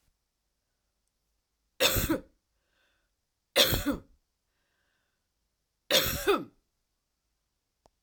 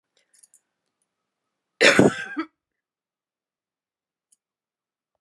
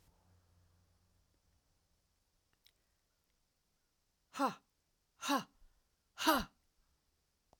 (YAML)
three_cough_length: 8.0 s
three_cough_amplitude: 14421
three_cough_signal_mean_std_ratio: 0.3
cough_length: 5.2 s
cough_amplitude: 32566
cough_signal_mean_std_ratio: 0.21
exhalation_length: 7.6 s
exhalation_amplitude: 4617
exhalation_signal_mean_std_ratio: 0.22
survey_phase: alpha (2021-03-01 to 2021-08-12)
age: 65+
gender: Female
wearing_mask: 'No'
symptom_none: true
smoker_status: Ex-smoker
respiratory_condition_asthma: false
respiratory_condition_other: false
recruitment_source: REACT
submission_delay: 1 day
covid_test_result: Negative
covid_test_method: RT-qPCR